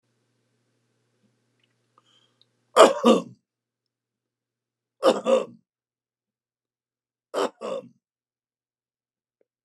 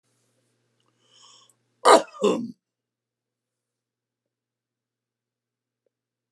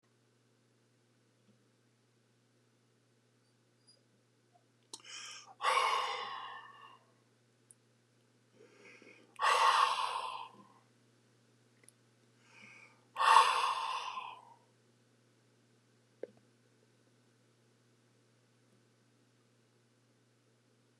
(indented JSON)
{
  "three_cough_length": "9.6 s",
  "three_cough_amplitude": 29204,
  "three_cough_signal_mean_std_ratio": 0.22,
  "cough_length": "6.3 s",
  "cough_amplitude": 29193,
  "cough_signal_mean_std_ratio": 0.18,
  "exhalation_length": "21.0 s",
  "exhalation_amplitude": 10362,
  "exhalation_signal_mean_std_ratio": 0.29,
  "survey_phase": "alpha (2021-03-01 to 2021-08-12)",
  "age": "65+",
  "gender": "Male",
  "wearing_mask": "No",
  "symptom_none": true,
  "smoker_status": "Ex-smoker",
  "respiratory_condition_asthma": false,
  "respiratory_condition_other": false,
  "recruitment_source": "REACT",
  "submission_delay": "2 days",
  "covid_test_result": "Negative",
  "covid_test_method": "RT-qPCR"
}